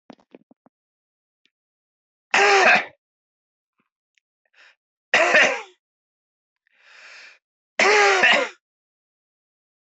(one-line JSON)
{"three_cough_length": "9.9 s", "three_cough_amplitude": 24305, "three_cough_signal_mean_std_ratio": 0.33, "survey_phase": "beta (2021-08-13 to 2022-03-07)", "age": "65+", "gender": "Male", "wearing_mask": "No", "symptom_none": true, "smoker_status": "Never smoked", "respiratory_condition_asthma": true, "respiratory_condition_other": true, "recruitment_source": "REACT", "submission_delay": "2 days", "covid_test_result": "Negative", "covid_test_method": "RT-qPCR", "influenza_a_test_result": "Negative", "influenza_b_test_result": "Negative"}